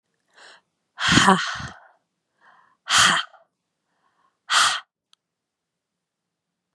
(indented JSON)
{
  "exhalation_length": "6.7 s",
  "exhalation_amplitude": 31541,
  "exhalation_signal_mean_std_ratio": 0.32,
  "survey_phase": "beta (2021-08-13 to 2022-03-07)",
  "age": "45-64",
  "gender": "Female",
  "wearing_mask": "No",
  "symptom_cough_any": true,
  "symptom_runny_or_blocked_nose": true,
  "symptom_sore_throat": true,
  "symptom_fever_high_temperature": true,
  "smoker_status": "Never smoked",
  "recruitment_source": "Test and Trace",
  "submission_delay": "2 days",
  "covid_test_result": "Positive",
  "covid_test_method": "LFT"
}